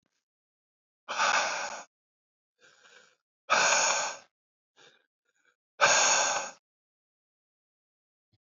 exhalation_length: 8.4 s
exhalation_amplitude: 11610
exhalation_signal_mean_std_ratio: 0.38
survey_phase: beta (2021-08-13 to 2022-03-07)
age: 45-64
gender: Male
wearing_mask: 'No'
symptom_cough_any: true
symptom_new_continuous_cough: true
symptom_runny_or_blocked_nose: true
symptom_shortness_of_breath: true
symptom_sore_throat: true
symptom_fatigue: true
symptom_fever_high_temperature: true
symptom_headache: true
symptom_onset: 3 days
smoker_status: Ex-smoker
respiratory_condition_asthma: false
respiratory_condition_other: false
recruitment_source: Test and Trace
submission_delay: 2 days
covid_test_result: Positive
covid_test_method: RT-qPCR
covid_ct_value: 31.9
covid_ct_gene: N gene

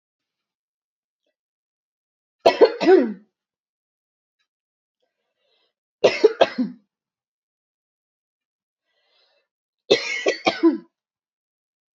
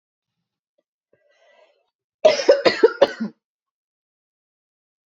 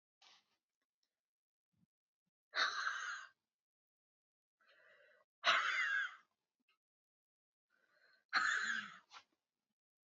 three_cough_length: 11.9 s
three_cough_amplitude: 29095
three_cough_signal_mean_std_ratio: 0.25
cough_length: 5.1 s
cough_amplitude: 28238
cough_signal_mean_std_ratio: 0.25
exhalation_length: 10.1 s
exhalation_amplitude: 3819
exhalation_signal_mean_std_ratio: 0.34
survey_phase: beta (2021-08-13 to 2022-03-07)
age: 45-64
gender: Female
wearing_mask: 'No'
symptom_none: true
smoker_status: Never smoked
respiratory_condition_asthma: true
respiratory_condition_other: false
recruitment_source: REACT
submission_delay: 3 days
covid_test_result: Negative
covid_test_method: RT-qPCR
influenza_a_test_result: Negative
influenza_b_test_result: Negative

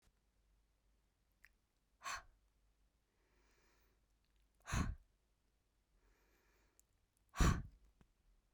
exhalation_length: 8.5 s
exhalation_amplitude: 2811
exhalation_signal_mean_std_ratio: 0.21
survey_phase: beta (2021-08-13 to 2022-03-07)
age: 45-64
gender: Female
wearing_mask: 'No'
symptom_none: true
smoker_status: Never smoked
respiratory_condition_asthma: false
respiratory_condition_other: false
recruitment_source: REACT
submission_delay: 1 day
covid_test_result: Negative
covid_test_method: RT-qPCR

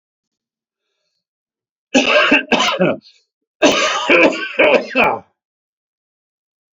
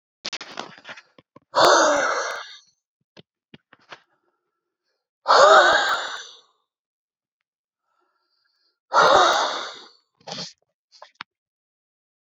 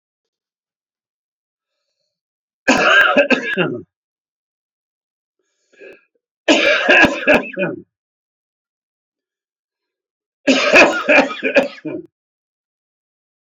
cough_length: 6.7 s
cough_amplitude: 30373
cough_signal_mean_std_ratio: 0.47
exhalation_length: 12.2 s
exhalation_amplitude: 28337
exhalation_signal_mean_std_ratio: 0.35
three_cough_length: 13.5 s
three_cough_amplitude: 29467
three_cough_signal_mean_std_ratio: 0.37
survey_phase: beta (2021-08-13 to 2022-03-07)
age: 65+
gender: Male
wearing_mask: 'No'
symptom_none: true
smoker_status: Ex-smoker
respiratory_condition_asthma: false
respiratory_condition_other: false
recruitment_source: REACT
submission_delay: 0 days
covid_test_result: Negative
covid_test_method: RT-qPCR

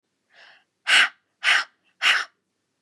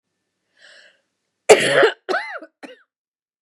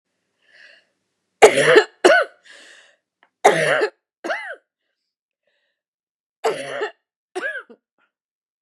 exhalation_length: 2.8 s
exhalation_amplitude: 19655
exhalation_signal_mean_std_ratio: 0.37
cough_length: 3.4 s
cough_amplitude: 32768
cough_signal_mean_std_ratio: 0.3
three_cough_length: 8.6 s
three_cough_amplitude: 32768
three_cough_signal_mean_std_ratio: 0.31
survey_phase: beta (2021-08-13 to 2022-03-07)
age: 45-64
gender: Female
wearing_mask: 'No'
symptom_cough_any: true
symptom_runny_or_blocked_nose: true
symptom_sore_throat: true
symptom_fatigue: true
symptom_headache: true
symptom_onset: 2 days
smoker_status: Never smoked
respiratory_condition_asthma: false
respiratory_condition_other: false
recruitment_source: Test and Trace
submission_delay: 1 day
covid_test_result: Positive
covid_test_method: RT-qPCR
covid_ct_value: 16.5
covid_ct_gene: ORF1ab gene
covid_ct_mean: 17.0
covid_viral_load: 2700000 copies/ml
covid_viral_load_category: High viral load (>1M copies/ml)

